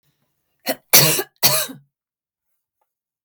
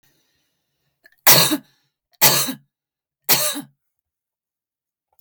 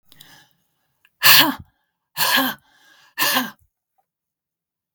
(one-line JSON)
{"cough_length": "3.2 s", "cough_amplitude": 32768, "cough_signal_mean_std_ratio": 0.31, "three_cough_length": "5.2 s", "three_cough_amplitude": 32768, "three_cough_signal_mean_std_ratio": 0.3, "exhalation_length": "4.9 s", "exhalation_amplitude": 32768, "exhalation_signal_mean_std_ratio": 0.32, "survey_phase": "beta (2021-08-13 to 2022-03-07)", "age": "45-64", "gender": "Female", "wearing_mask": "No", "symptom_none": true, "smoker_status": "Never smoked", "respiratory_condition_asthma": false, "respiratory_condition_other": false, "recruitment_source": "REACT", "submission_delay": "2 days", "covid_test_result": "Negative", "covid_test_method": "RT-qPCR", "influenza_a_test_result": "Negative", "influenza_b_test_result": "Negative"}